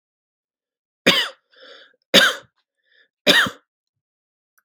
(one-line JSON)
{"three_cough_length": "4.6 s", "three_cough_amplitude": 32768, "three_cough_signal_mean_std_ratio": 0.28, "survey_phase": "beta (2021-08-13 to 2022-03-07)", "age": "45-64", "gender": "Male", "wearing_mask": "No", "symptom_none": true, "smoker_status": "Ex-smoker", "respiratory_condition_asthma": false, "respiratory_condition_other": false, "recruitment_source": "REACT", "submission_delay": "6 days", "covid_test_result": "Negative", "covid_test_method": "RT-qPCR", "influenza_a_test_result": "Negative", "influenza_b_test_result": "Negative"}